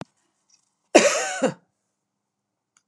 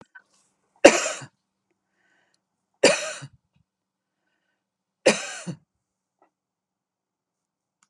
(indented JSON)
{
  "cough_length": "2.9 s",
  "cough_amplitude": 32767,
  "cough_signal_mean_std_ratio": 0.28,
  "three_cough_length": "7.9 s",
  "three_cough_amplitude": 32768,
  "three_cough_signal_mean_std_ratio": 0.19,
  "survey_phase": "beta (2021-08-13 to 2022-03-07)",
  "age": "45-64",
  "gender": "Female",
  "wearing_mask": "No",
  "symptom_none": true,
  "smoker_status": "Never smoked",
  "respiratory_condition_asthma": false,
  "respiratory_condition_other": false,
  "recruitment_source": "REACT",
  "submission_delay": "3 days",
  "covid_test_result": "Negative",
  "covid_test_method": "RT-qPCR",
  "influenza_a_test_result": "Negative",
  "influenza_b_test_result": "Negative"
}